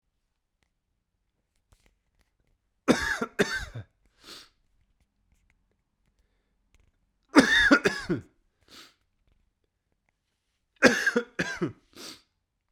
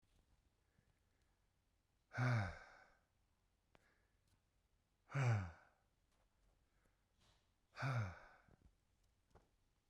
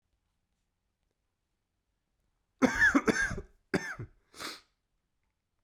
three_cough_length: 12.7 s
three_cough_amplitude: 29139
three_cough_signal_mean_std_ratio: 0.27
exhalation_length: 9.9 s
exhalation_amplitude: 1351
exhalation_signal_mean_std_ratio: 0.3
cough_length: 5.6 s
cough_amplitude: 10068
cough_signal_mean_std_ratio: 0.3
survey_phase: beta (2021-08-13 to 2022-03-07)
age: 18-44
gender: Male
wearing_mask: 'No'
symptom_cough_any: true
symptom_new_continuous_cough: true
symptom_fatigue: true
symptom_fever_high_temperature: true
symptom_change_to_sense_of_smell_or_taste: true
symptom_loss_of_taste: true
symptom_onset: 3 days
smoker_status: Never smoked
respiratory_condition_asthma: false
respiratory_condition_other: false
recruitment_source: Test and Trace
submission_delay: 1 day
covid_test_result: Positive
covid_test_method: ePCR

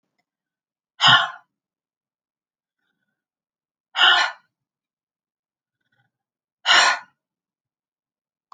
exhalation_length: 8.5 s
exhalation_amplitude: 28503
exhalation_signal_mean_std_ratio: 0.25
survey_phase: beta (2021-08-13 to 2022-03-07)
age: 45-64
gender: Female
wearing_mask: 'No'
symptom_none: true
smoker_status: Never smoked
respiratory_condition_asthma: false
respiratory_condition_other: false
recruitment_source: REACT
submission_delay: 6 days
covid_test_result: Negative
covid_test_method: RT-qPCR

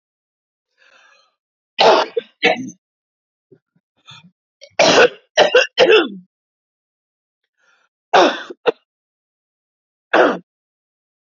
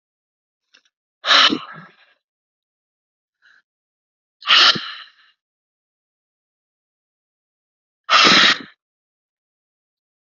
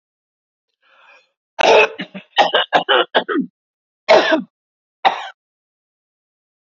three_cough_length: 11.3 s
three_cough_amplitude: 31004
three_cough_signal_mean_std_ratio: 0.32
exhalation_length: 10.3 s
exhalation_amplitude: 30775
exhalation_signal_mean_std_ratio: 0.27
cough_length: 6.7 s
cough_amplitude: 32768
cough_signal_mean_std_ratio: 0.37
survey_phase: beta (2021-08-13 to 2022-03-07)
age: 45-64
gender: Female
wearing_mask: 'No'
symptom_fatigue: true
symptom_headache: true
symptom_change_to_sense_of_smell_or_taste: true
symptom_onset: 10 days
smoker_status: Never smoked
respiratory_condition_asthma: false
respiratory_condition_other: false
recruitment_source: REACT
submission_delay: 1 day
covid_test_result: Negative
covid_test_method: RT-qPCR
influenza_a_test_result: Negative
influenza_b_test_result: Negative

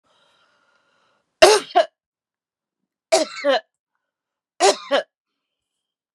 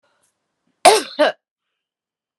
three_cough_length: 6.1 s
three_cough_amplitude: 32768
three_cough_signal_mean_std_ratio: 0.28
cough_length: 2.4 s
cough_amplitude: 32768
cough_signal_mean_std_ratio: 0.27
survey_phase: beta (2021-08-13 to 2022-03-07)
age: 45-64
gender: Female
wearing_mask: 'No'
symptom_none: true
smoker_status: Current smoker (1 to 10 cigarettes per day)
respiratory_condition_asthma: false
respiratory_condition_other: false
recruitment_source: REACT
submission_delay: 1 day
covid_test_result: Negative
covid_test_method: RT-qPCR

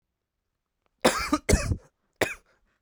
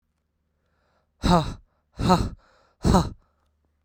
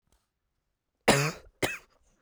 three_cough_length: 2.8 s
three_cough_amplitude: 17612
three_cough_signal_mean_std_ratio: 0.34
exhalation_length: 3.8 s
exhalation_amplitude: 18217
exhalation_signal_mean_std_ratio: 0.36
cough_length: 2.2 s
cough_amplitude: 15118
cough_signal_mean_std_ratio: 0.29
survey_phase: beta (2021-08-13 to 2022-03-07)
age: 18-44
gender: Male
wearing_mask: 'No'
symptom_cough_any: true
symptom_new_continuous_cough: true
symptom_runny_or_blocked_nose: true
symptom_sore_throat: true
symptom_fatigue: true
symptom_fever_high_temperature: true
symptom_onset: 3 days
smoker_status: Never smoked
respiratory_condition_asthma: false
respiratory_condition_other: false
recruitment_source: Test and Trace
submission_delay: 2 days
covid_test_result: Positive
covid_test_method: RT-qPCR
covid_ct_value: 20.6
covid_ct_gene: ORF1ab gene
covid_ct_mean: 21.0
covid_viral_load: 130000 copies/ml
covid_viral_load_category: Low viral load (10K-1M copies/ml)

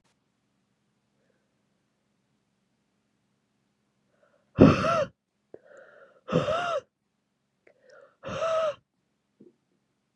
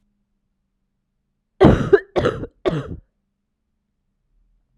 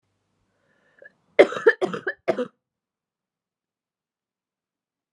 exhalation_length: 10.2 s
exhalation_amplitude: 26580
exhalation_signal_mean_std_ratio: 0.25
cough_length: 4.8 s
cough_amplitude: 32768
cough_signal_mean_std_ratio: 0.28
three_cough_length: 5.1 s
three_cough_amplitude: 31353
three_cough_signal_mean_std_ratio: 0.2
survey_phase: alpha (2021-03-01 to 2021-08-12)
age: 18-44
gender: Female
wearing_mask: 'No'
symptom_cough_any: true
symptom_shortness_of_breath: true
symptom_fatigue: true
symptom_headache: true
symptom_change_to_sense_of_smell_or_taste: true
symptom_onset: 4 days
smoker_status: Never smoked
respiratory_condition_asthma: false
respiratory_condition_other: false
recruitment_source: Test and Trace
submission_delay: 3 days
covid_test_result: Positive
covid_test_method: RT-qPCR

